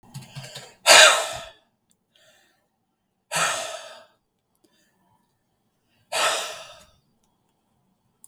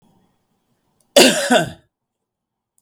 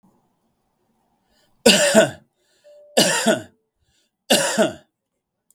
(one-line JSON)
{"exhalation_length": "8.3 s", "exhalation_amplitude": 32768, "exhalation_signal_mean_std_ratio": 0.26, "cough_length": "2.8 s", "cough_amplitude": 32768, "cough_signal_mean_std_ratio": 0.3, "three_cough_length": "5.5 s", "three_cough_amplitude": 32768, "three_cough_signal_mean_std_ratio": 0.37, "survey_phase": "beta (2021-08-13 to 2022-03-07)", "age": "45-64", "gender": "Male", "wearing_mask": "No", "symptom_none": true, "smoker_status": "Ex-smoker", "respiratory_condition_asthma": false, "respiratory_condition_other": false, "recruitment_source": "REACT", "submission_delay": "4 days", "covid_test_result": "Negative", "covid_test_method": "RT-qPCR", "influenza_a_test_result": "Unknown/Void", "influenza_b_test_result": "Unknown/Void"}